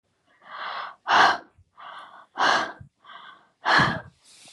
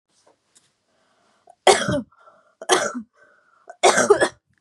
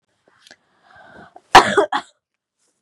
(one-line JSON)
{"exhalation_length": "4.5 s", "exhalation_amplitude": 20434, "exhalation_signal_mean_std_ratio": 0.42, "three_cough_length": "4.6 s", "three_cough_amplitude": 30447, "three_cough_signal_mean_std_ratio": 0.34, "cough_length": "2.8 s", "cough_amplitude": 32768, "cough_signal_mean_std_ratio": 0.24, "survey_phase": "beta (2021-08-13 to 2022-03-07)", "age": "18-44", "gender": "Female", "wearing_mask": "No", "symptom_cough_any": true, "symptom_runny_or_blocked_nose": true, "symptom_sore_throat": true, "symptom_headache": true, "symptom_onset": "13 days", "smoker_status": "Never smoked", "respiratory_condition_asthma": false, "respiratory_condition_other": false, "recruitment_source": "REACT", "submission_delay": "2 days", "covid_test_result": "Negative", "covid_test_method": "RT-qPCR"}